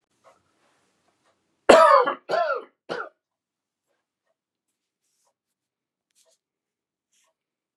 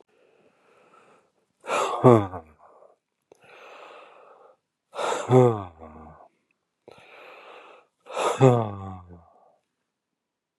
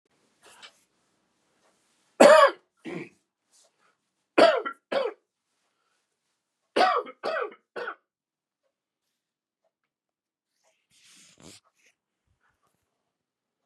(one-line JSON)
{"cough_length": "7.8 s", "cough_amplitude": 32767, "cough_signal_mean_std_ratio": 0.22, "exhalation_length": "10.6 s", "exhalation_amplitude": 28559, "exhalation_signal_mean_std_ratio": 0.29, "three_cough_length": "13.7 s", "three_cough_amplitude": 25536, "three_cough_signal_mean_std_ratio": 0.22, "survey_phase": "beta (2021-08-13 to 2022-03-07)", "age": "45-64", "gender": "Male", "wearing_mask": "Yes", "symptom_new_continuous_cough": true, "symptom_runny_or_blocked_nose": true, "symptom_fatigue": true, "symptom_fever_high_temperature": true, "symptom_headache": true, "symptom_change_to_sense_of_smell_or_taste": true, "symptom_onset": "4 days", "smoker_status": "Never smoked", "respiratory_condition_asthma": false, "respiratory_condition_other": false, "recruitment_source": "Test and Trace", "submission_delay": "2 days", "covid_test_result": "Positive", "covid_test_method": "RT-qPCR"}